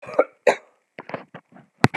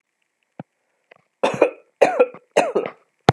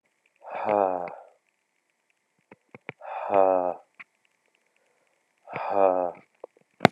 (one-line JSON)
{"cough_length": "2.0 s", "cough_amplitude": 32768, "cough_signal_mean_std_ratio": 0.26, "three_cough_length": "3.3 s", "three_cough_amplitude": 32768, "three_cough_signal_mean_std_ratio": 0.33, "exhalation_length": "6.9 s", "exhalation_amplitude": 32768, "exhalation_signal_mean_std_ratio": 0.32, "survey_phase": "beta (2021-08-13 to 2022-03-07)", "age": "45-64", "gender": "Male", "wearing_mask": "No", "symptom_cough_any": true, "symptom_runny_or_blocked_nose": true, "symptom_sore_throat": true, "symptom_fatigue": true, "symptom_headache": true, "symptom_onset": "9 days", "smoker_status": "Ex-smoker", "respiratory_condition_asthma": true, "respiratory_condition_other": false, "recruitment_source": "Test and Trace", "submission_delay": "2 days", "covid_test_result": "Positive", "covid_test_method": "RT-qPCR", "covid_ct_value": 23.1, "covid_ct_gene": "ORF1ab gene", "covid_ct_mean": 23.7, "covid_viral_load": "16000 copies/ml", "covid_viral_load_category": "Low viral load (10K-1M copies/ml)"}